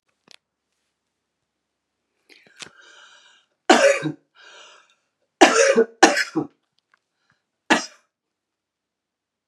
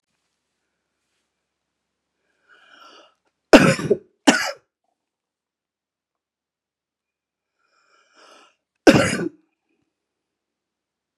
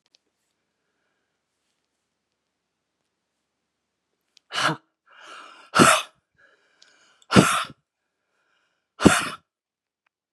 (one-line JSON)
{"three_cough_length": "9.5 s", "three_cough_amplitude": 32768, "three_cough_signal_mean_std_ratio": 0.26, "cough_length": "11.2 s", "cough_amplitude": 32768, "cough_signal_mean_std_ratio": 0.19, "exhalation_length": "10.3 s", "exhalation_amplitude": 32768, "exhalation_signal_mean_std_ratio": 0.22, "survey_phase": "beta (2021-08-13 to 2022-03-07)", "age": "65+", "gender": "Female", "wearing_mask": "No", "symptom_none": true, "smoker_status": "Ex-smoker", "respiratory_condition_asthma": false, "respiratory_condition_other": false, "recruitment_source": "REACT", "submission_delay": "1 day", "covid_test_result": "Negative", "covid_test_method": "RT-qPCR", "influenza_a_test_result": "Negative", "influenza_b_test_result": "Negative"}